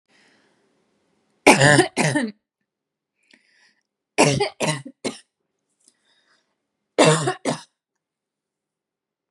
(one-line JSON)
{"three_cough_length": "9.3 s", "three_cough_amplitude": 32767, "three_cough_signal_mean_std_ratio": 0.31, "survey_phase": "beta (2021-08-13 to 2022-03-07)", "age": "18-44", "gender": "Female", "wearing_mask": "No", "symptom_none": true, "smoker_status": "Ex-smoker", "respiratory_condition_asthma": false, "respiratory_condition_other": false, "recruitment_source": "REACT", "submission_delay": "14 days", "covid_test_result": "Negative", "covid_test_method": "RT-qPCR"}